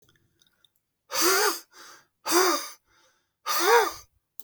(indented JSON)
{
  "exhalation_length": "4.4 s",
  "exhalation_amplitude": 15268,
  "exhalation_signal_mean_std_ratio": 0.44,
  "survey_phase": "beta (2021-08-13 to 2022-03-07)",
  "age": "65+",
  "gender": "Male",
  "wearing_mask": "No",
  "symptom_fatigue": true,
  "smoker_status": "Ex-smoker",
  "respiratory_condition_asthma": false,
  "respiratory_condition_other": false,
  "recruitment_source": "REACT",
  "submission_delay": "1 day",
  "covid_test_result": "Negative",
  "covid_test_method": "RT-qPCR",
  "influenza_a_test_result": "Negative",
  "influenza_b_test_result": "Negative"
}